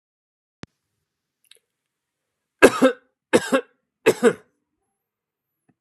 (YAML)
three_cough_length: 5.8 s
three_cough_amplitude: 32768
three_cough_signal_mean_std_ratio: 0.23
survey_phase: alpha (2021-03-01 to 2021-08-12)
age: 45-64
gender: Male
wearing_mask: 'No'
symptom_none: true
smoker_status: Never smoked
respiratory_condition_asthma: false
respiratory_condition_other: false
recruitment_source: REACT
submission_delay: 2 days
covid_test_result: Negative
covid_test_method: RT-qPCR